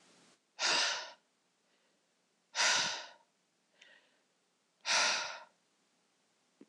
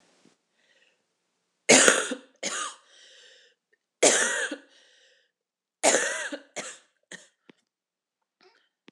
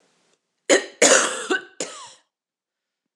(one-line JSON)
{"exhalation_length": "6.7 s", "exhalation_amplitude": 4793, "exhalation_signal_mean_std_ratio": 0.38, "three_cough_length": "8.9 s", "three_cough_amplitude": 26028, "three_cough_signal_mean_std_ratio": 0.3, "cough_length": "3.2 s", "cough_amplitude": 26027, "cough_signal_mean_std_ratio": 0.35, "survey_phase": "alpha (2021-03-01 to 2021-08-12)", "age": "18-44", "gender": "Female", "wearing_mask": "No", "symptom_cough_any": true, "symptom_diarrhoea": true, "symptom_fatigue": true, "symptom_fever_high_temperature": true, "symptom_headache": true, "symptom_onset": "3 days", "smoker_status": "Never smoked", "respiratory_condition_asthma": false, "respiratory_condition_other": false, "recruitment_source": "Test and Trace", "submission_delay": "2 days", "covid_test_result": "Positive", "covid_test_method": "RT-qPCR"}